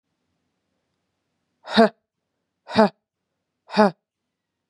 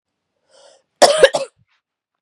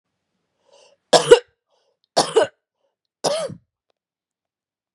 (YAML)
exhalation_length: 4.7 s
exhalation_amplitude: 31003
exhalation_signal_mean_std_ratio: 0.22
cough_length: 2.2 s
cough_amplitude: 32768
cough_signal_mean_std_ratio: 0.28
three_cough_length: 4.9 s
three_cough_amplitude: 32768
three_cough_signal_mean_std_ratio: 0.24
survey_phase: beta (2021-08-13 to 2022-03-07)
age: 18-44
gender: Female
wearing_mask: 'No'
symptom_runny_or_blocked_nose: true
symptom_headache: true
symptom_change_to_sense_of_smell_or_taste: true
symptom_onset: 4 days
smoker_status: Ex-smoker
respiratory_condition_asthma: false
respiratory_condition_other: false
recruitment_source: Test and Trace
submission_delay: 2 days
covid_test_result: Positive
covid_test_method: RT-qPCR
covid_ct_value: 26.6
covid_ct_gene: N gene